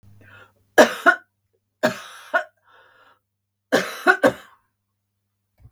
{"three_cough_length": "5.7 s", "three_cough_amplitude": 32768, "three_cough_signal_mean_std_ratio": 0.28, "survey_phase": "beta (2021-08-13 to 2022-03-07)", "age": "65+", "gender": "Female", "wearing_mask": "No", "symptom_none": true, "smoker_status": "Ex-smoker", "respiratory_condition_asthma": false, "respiratory_condition_other": false, "recruitment_source": "REACT", "submission_delay": "1 day", "covid_test_result": "Negative", "covid_test_method": "RT-qPCR"}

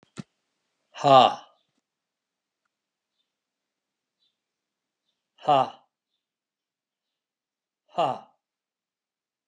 {"exhalation_length": "9.5 s", "exhalation_amplitude": 23126, "exhalation_signal_mean_std_ratio": 0.19, "survey_phase": "alpha (2021-03-01 to 2021-08-12)", "age": "45-64", "gender": "Male", "wearing_mask": "No", "symptom_none": true, "smoker_status": "Never smoked", "respiratory_condition_asthma": true, "respiratory_condition_other": false, "recruitment_source": "REACT", "submission_delay": "2 days", "covid_test_result": "Negative", "covid_test_method": "RT-qPCR"}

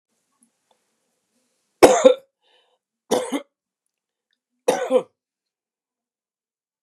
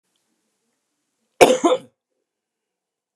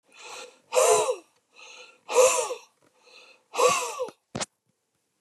{"three_cough_length": "6.8 s", "three_cough_amplitude": 32768, "three_cough_signal_mean_std_ratio": 0.23, "cough_length": "3.2 s", "cough_amplitude": 32768, "cough_signal_mean_std_ratio": 0.23, "exhalation_length": "5.2 s", "exhalation_amplitude": 15067, "exhalation_signal_mean_std_ratio": 0.42, "survey_phase": "beta (2021-08-13 to 2022-03-07)", "age": "45-64", "gender": "Male", "wearing_mask": "No", "symptom_none": true, "smoker_status": "Ex-smoker", "respiratory_condition_asthma": false, "respiratory_condition_other": false, "recruitment_source": "REACT", "submission_delay": "1 day", "covid_test_result": "Negative", "covid_test_method": "RT-qPCR", "influenza_a_test_result": "Negative", "influenza_b_test_result": "Negative"}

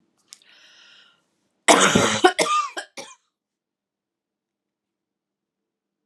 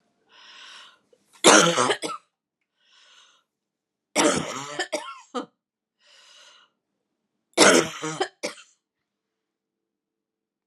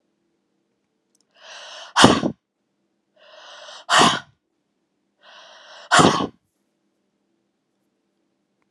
{"cough_length": "6.1 s", "cough_amplitude": 32722, "cough_signal_mean_std_ratio": 0.29, "three_cough_length": "10.7 s", "three_cough_amplitude": 32390, "three_cough_signal_mean_std_ratio": 0.29, "exhalation_length": "8.7 s", "exhalation_amplitude": 32768, "exhalation_signal_mean_std_ratio": 0.26, "survey_phase": "alpha (2021-03-01 to 2021-08-12)", "age": "45-64", "gender": "Female", "wearing_mask": "No", "symptom_cough_any": true, "symptom_fatigue": true, "symptom_headache": true, "symptom_loss_of_taste": true, "symptom_onset": "6 days", "smoker_status": "Prefer not to say", "respiratory_condition_asthma": false, "respiratory_condition_other": false, "recruitment_source": "Test and Trace", "submission_delay": "2 days", "covid_test_result": "Positive", "covid_test_method": "RT-qPCR"}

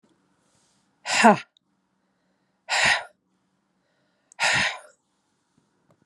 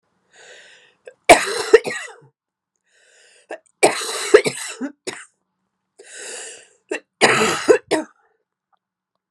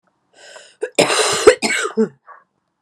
{"exhalation_length": "6.1 s", "exhalation_amplitude": 28470, "exhalation_signal_mean_std_ratio": 0.29, "three_cough_length": "9.3 s", "three_cough_amplitude": 32768, "three_cough_signal_mean_std_ratio": 0.31, "cough_length": "2.8 s", "cough_amplitude": 32768, "cough_signal_mean_std_ratio": 0.43, "survey_phase": "beta (2021-08-13 to 2022-03-07)", "age": "45-64", "gender": "Female", "wearing_mask": "No", "symptom_cough_any": true, "symptom_runny_or_blocked_nose": true, "symptom_onset": "4 days", "smoker_status": "Never smoked", "respiratory_condition_asthma": false, "respiratory_condition_other": false, "recruitment_source": "Test and Trace", "submission_delay": "1 day", "covid_test_result": "Positive", "covid_test_method": "RT-qPCR", "covid_ct_value": 11.3, "covid_ct_gene": "ORF1ab gene", "covid_ct_mean": 11.8, "covid_viral_load": "130000000 copies/ml", "covid_viral_load_category": "High viral load (>1M copies/ml)"}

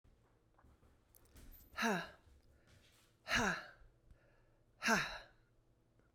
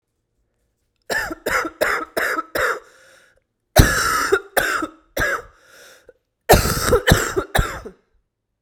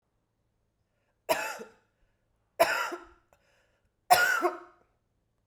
{"exhalation_length": "6.1 s", "exhalation_amplitude": 3056, "exhalation_signal_mean_std_ratio": 0.35, "cough_length": "8.6 s", "cough_amplitude": 32768, "cough_signal_mean_std_ratio": 0.47, "three_cough_length": "5.5 s", "three_cough_amplitude": 16288, "three_cough_signal_mean_std_ratio": 0.32, "survey_phase": "beta (2021-08-13 to 2022-03-07)", "age": "45-64", "gender": "Female", "wearing_mask": "No", "symptom_cough_any": true, "symptom_new_continuous_cough": true, "symptom_runny_or_blocked_nose": true, "symptom_shortness_of_breath": true, "symptom_sore_throat": true, "symptom_fatigue": true, "symptom_fever_high_temperature": true, "symptom_headache": true, "symptom_change_to_sense_of_smell_or_taste": true, "symptom_loss_of_taste": true, "symptom_onset": "8 days", "smoker_status": "Never smoked", "respiratory_condition_asthma": false, "respiratory_condition_other": true, "recruitment_source": "Test and Trace", "submission_delay": "1 day", "covid_test_result": "Positive", "covid_test_method": "RT-qPCR", "covid_ct_value": 24.0, "covid_ct_gene": "ORF1ab gene", "covid_ct_mean": 24.6, "covid_viral_load": "8700 copies/ml", "covid_viral_load_category": "Minimal viral load (< 10K copies/ml)"}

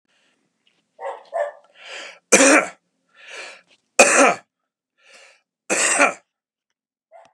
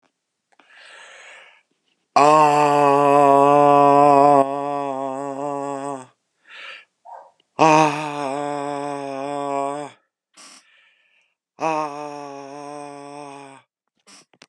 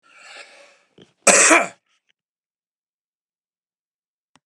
{"three_cough_length": "7.3 s", "three_cough_amplitude": 32768, "three_cough_signal_mean_std_ratio": 0.33, "exhalation_length": "14.5 s", "exhalation_amplitude": 29349, "exhalation_signal_mean_std_ratio": 0.43, "cough_length": "4.5 s", "cough_amplitude": 32767, "cough_signal_mean_std_ratio": 0.24, "survey_phase": "beta (2021-08-13 to 2022-03-07)", "age": "45-64", "gender": "Male", "wearing_mask": "No", "symptom_none": true, "smoker_status": "Never smoked", "respiratory_condition_asthma": false, "respiratory_condition_other": false, "recruitment_source": "REACT", "submission_delay": "3 days", "covid_test_result": "Negative", "covid_test_method": "RT-qPCR", "influenza_a_test_result": "Negative", "influenza_b_test_result": "Negative"}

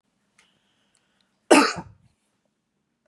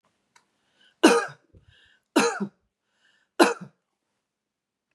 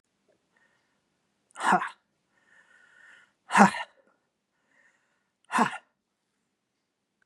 {"cough_length": "3.1 s", "cough_amplitude": 30546, "cough_signal_mean_std_ratio": 0.2, "three_cough_length": "4.9 s", "three_cough_amplitude": 29003, "three_cough_signal_mean_std_ratio": 0.26, "exhalation_length": "7.3 s", "exhalation_amplitude": 31352, "exhalation_signal_mean_std_ratio": 0.21, "survey_phase": "beta (2021-08-13 to 2022-03-07)", "age": "65+", "gender": "Female", "wearing_mask": "No", "symptom_none": true, "smoker_status": "Never smoked", "respiratory_condition_asthma": false, "respiratory_condition_other": false, "recruitment_source": "REACT", "submission_delay": "2 days", "covid_test_result": "Negative", "covid_test_method": "RT-qPCR", "influenza_a_test_result": "Negative", "influenza_b_test_result": "Negative"}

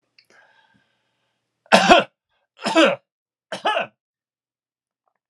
{"three_cough_length": "5.3 s", "three_cough_amplitude": 32768, "three_cough_signal_mean_std_ratio": 0.29, "survey_phase": "alpha (2021-03-01 to 2021-08-12)", "age": "65+", "gender": "Male", "wearing_mask": "No", "symptom_none": true, "smoker_status": "Never smoked", "respiratory_condition_asthma": false, "respiratory_condition_other": false, "recruitment_source": "REACT", "submission_delay": "3 days", "covid_test_result": "Negative", "covid_test_method": "RT-qPCR"}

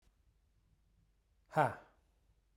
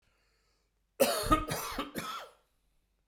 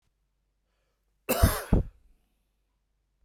{"exhalation_length": "2.6 s", "exhalation_amplitude": 4465, "exhalation_signal_mean_std_ratio": 0.21, "three_cough_length": "3.1 s", "three_cough_amplitude": 8489, "three_cough_signal_mean_std_ratio": 0.41, "cough_length": "3.2 s", "cough_amplitude": 15731, "cough_signal_mean_std_ratio": 0.27, "survey_phase": "beta (2021-08-13 to 2022-03-07)", "age": "45-64", "gender": "Male", "wearing_mask": "No", "symptom_cough_any": true, "symptom_sore_throat": true, "symptom_abdominal_pain": true, "symptom_headache": true, "smoker_status": "Never smoked", "respiratory_condition_asthma": false, "respiratory_condition_other": false, "recruitment_source": "Test and Trace", "submission_delay": "1 day", "covid_test_result": "Positive", "covid_test_method": "RT-qPCR", "covid_ct_value": 33.3, "covid_ct_gene": "ORF1ab gene", "covid_ct_mean": 33.7, "covid_viral_load": "8.7 copies/ml", "covid_viral_load_category": "Minimal viral load (< 10K copies/ml)"}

